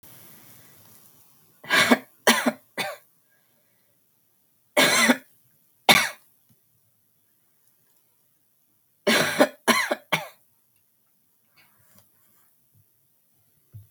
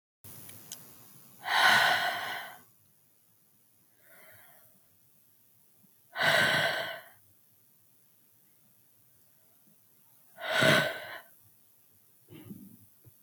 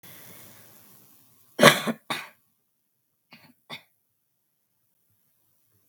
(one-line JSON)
{"three_cough_length": "13.9 s", "three_cough_amplitude": 32523, "three_cough_signal_mean_std_ratio": 0.29, "exhalation_length": "13.2 s", "exhalation_amplitude": 9559, "exhalation_signal_mean_std_ratio": 0.36, "cough_length": "5.9 s", "cough_amplitude": 32768, "cough_signal_mean_std_ratio": 0.18, "survey_phase": "beta (2021-08-13 to 2022-03-07)", "age": "18-44", "gender": "Female", "wearing_mask": "No", "symptom_cough_any": true, "symptom_runny_or_blocked_nose": true, "symptom_sore_throat": true, "symptom_onset": "4 days", "smoker_status": "Never smoked", "respiratory_condition_asthma": false, "respiratory_condition_other": false, "recruitment_source": "Test and Trace", "submission_delay": "1 day", "covid_test_result": "Positive", "covid_test_method": "RT-qPCR"}